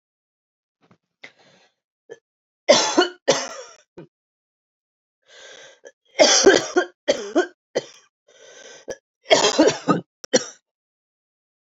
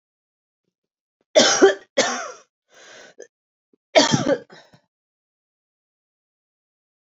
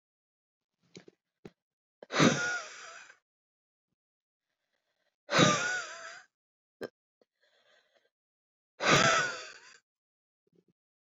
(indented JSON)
{
  "three_cough_length": "11.7 s",
  "three_cough_amplitude": 29891,
  "three_cough_signal_mean_std_ratio": 0.32,
  "cough_length": "7.2 s",
  "cough_amplitude": 29463,
  "cough_signal_mean_std_ratio": 0.28,
  "exhalation_length": "11.2 s",
  "exhalation_amplitude": 12569,
  "exhalation_signal_mean_std_ratio": 0.3,
  "survey_phase": "alpha (2021-03-01 to 2021-08-12)",
  "age": "18-44",
  "gender": "Female",
  "wearing_mask": "No",
  "symptom_shortness_of_breath": true,
  "symptom_abdominal_pain": true,
  "symptom_diarrhoea": true,
  "symptom_fatigue": true,
  "symptom_fever_high_temperature": true,
  "symptom_headache": true,
  "smoker_status": "Never smoked",
  "respiratory_condition_asthma": true,
  "respiratory_condition_other": false,
  "recruitment_source": "Test and Trace",
  "submission_delay": "2 days",
  "covid_test_result": "Positive",
  "covid_test_method": "RT-qPCR",
  "covid_ct_value": 20.3,
  "covid_ct_gene": "ORF1ab gene",
  "covid_ct_mean": 21.1,
  "covid_viral_load": "120000 copies/ml",
  "covid_viral_load_category": "Low viral load (10K-1M copies/ml)"
}